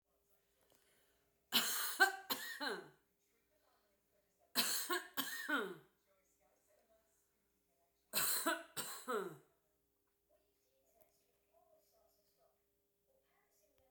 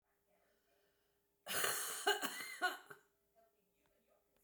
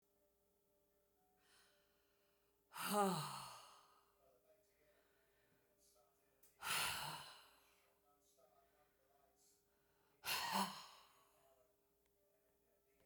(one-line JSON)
{"three_cough_length": "13.9 s", "three_cough_amplitude": 4030, "three_cough_signal_mean_std_ratio": 0.35, "cough_length": "4.4 s", "cough_amplitude": 2887, "cough_signal_mean_std_ratio": 0.39, "exhalation_length": "13.1 s", "exhalation_amplitude": 1692, "exhalation_signal_mean_std_ratio": 0.32, "survey_phase": "beta (2021-08-13 to 2022-03-07)", "age": "45-64", "gender": "Female", "wearing_mask": "No", "symptom_none": true, "smoker_status": "Current smoker (11 or more cigarettes per day)", "respiratory_condition_asthma": true, "respiratory_condition_other": false, "recruitment_source": "REACT", "submission_delay": "0 days", "covid_test_result": "Negative", "covid_test_method": "RT-qPCR"}